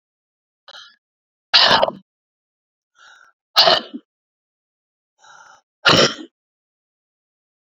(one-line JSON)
{"exhalation_length": "7.8 s", "exhalation_amplitude": 31424, "exhalation_signal_mean_std_ratio": 0.27, "survey_phase": "beta (2021-08-13 to 2022-03-07)", "age": "45-64", "gender": "Female", "wearing_mask": "No", "symptom_cough_any": true, "symptom_runny_or_blocked_nose": true, "symptom_shortness_of_breath": true, "symptom_fatigue": true, "smoker_status": "Ex-smoker", "respiratory_condition_asthma": true, "respiratory_condition_other": false, "recruitment_source": "Test and Trace", "submission_delay": "2 days", "covid_test_method": "RT-qPCR", "covid_ct_value": 21.2, "covid_ct_gene": "ORF1ab gene"}